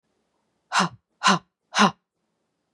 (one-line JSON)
{"exhalation_length": "2.7 s", "exhalation_amplitude": 24008, "exhalation_signal_mean_std_ratio": 0.31, "survey_phase": "beta (2021-08-13 to 2022-03-07)", "age": "45-64", "gender": "Female", "wearing_mask": "No", "symptom_fatigue": true, "smoker_status": "Never smoked", "respiratory_condition_asthma": true, "respiratory_condition_other": false, "recruitment_source": "Test and Trace", "submission_delay": "2 days", "covid_test_result": "Negative", "covid_test_method": "LAMP"}